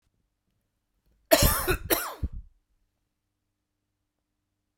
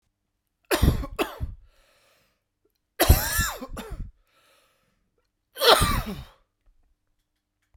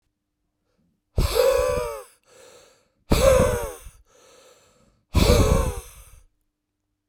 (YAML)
cough_length: 4.8 s
cough_amplitude: 24797
cough_signal_mean_std_ratio: 0.28
three_cough_length: 7.8 s
three_cough_amplitude: 27929
three_cough_signal_mean_std_ratio: 0.34
exhalation_length: 7.1 s
exhalation_amplitude: 24403
exhalation_signal_mean_std_ratio: 0.43
survey_phase: beta (2021-08-13 to 2022-03-07)
age: 18-44
gender: Male
wearing_mask: 'No'
symptom_cough_any: true
symptom_runny_or_blocked_nose: true
smoker_status: Ex-smoker
respiratory_condition_asthma: false
respiratory_condition_other: false
recruitment_source: Test and Trace
submission_delay: 1 day
covid_test_result: Positive
covid_test_method: LFT